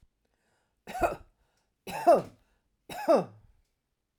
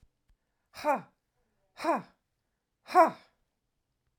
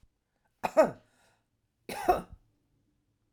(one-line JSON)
{"three_cough_length": "4.2 s", "three_cough_amplitude": 9523, "three_cough_signal_mean_std_ratio": 0.3, "exhalation_length": "4.2 s", "exhalation_amplitude": 11936, "exhalation_signal_mean_std_ratio": 0.26, "cough_length": "3.3 s", "cough_amplitude": 10402, "cough_signal_mean_std_ratio": 0.25, "survey_phase": "alpha (2021-03-01 to 2021-08-12)", "age": "65+", "gender": "Female", "wearing_mask": "No", "symptom_none": true, "smoker_status": "Never smoked", "respiratory_condition_asthma": false, "respiratory_condition_other": false, "recruitment_source": "REACT", "submission_delay": "1 day", "covid_test_result": "Negative", "covid_test_method": "RT-qPCR"}